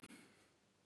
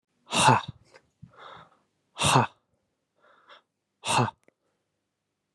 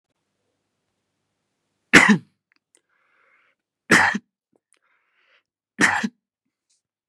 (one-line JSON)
{"cough_length": "0.9 s", "cough_amplitude": 195, "cough_signal_mean_std_ratio": 0.68, "exhalation_length": "5.5 s", "exhalation_amplitude": 22187, "exhalation_signal_mean_std_ratio": 0.3, "three_cough_length": "7.1 s", "three_cough_amplitude": 32768, "three_cough_signal_mean_std_ratio": 0.24, "survey_phase": "beta (2021-08-13 to 2022-03-07)", "age": "18-44", "gender": "Male", "wearing_mask": "No", "symptom_none": true, "smoker_status": "Never smoked", "respiratory_condition_asthma": false, "respiratory_condition_other": false, "recruitment_source": "REACT", "submission_delay": "2 days", "covid_test_result": "Negative", "covid_test_method": "RT-qPCR", "influenza_a_test_result": "Negative", "influenza_b_test_result": "Negative"}